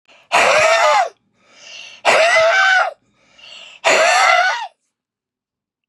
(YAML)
exhalation_length: 5.9 s
exhalation_amplitude: 32215
exhalation_signal_mean_std_ratio: 0.6
survey_phase: beta (2021-08-13 to 2022-03-07)
age: 65+
gender: Male
wearing_mask: 'No'
symptom_none: true
smoker_status: Never smoked
respiratory_condition_asthma: false
respiratory_condition_other: false
recruitment_source: REACT
submission_delay: 1 day
covid_test_result: Negative
covid_test_method: RT-qPCR
influenza_a_test_result: Negative
influenza_b_test_result: Negative